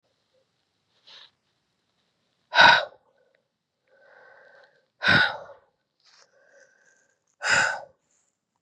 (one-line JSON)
{"exhalation_length": "8.6 s", "exhalation_amplitude": 28189, "exhalation_signal_mean_std_ratio": 0.25, "survey_phase": "beta (2021-08-13 to 2022-03-07)", "age": "45-64", "gender": "Female", "wearing_mask": "No", "symptom_cough_any": true, "symptom_runny_or_blocked_nose": true, "symptom_fatigue": true, "symptom_headache": true, "symptom_change_to_sense_of_smell_or_taste": true, "symptom_loss_of_taste": true, "symptom_onset": "13 days", "smoker_status": "Never smoked", "respiratory_condition_asthma": false, "respiratory_condition_other": false, "recruitment_source": "Test and Trace", "submission_delay": "2 days", "covid_test_result": "Positive", "covid_test_method": "RT-qPCR", "covid_ct_value": 29.0, "covid_ct_gene": "N gene"}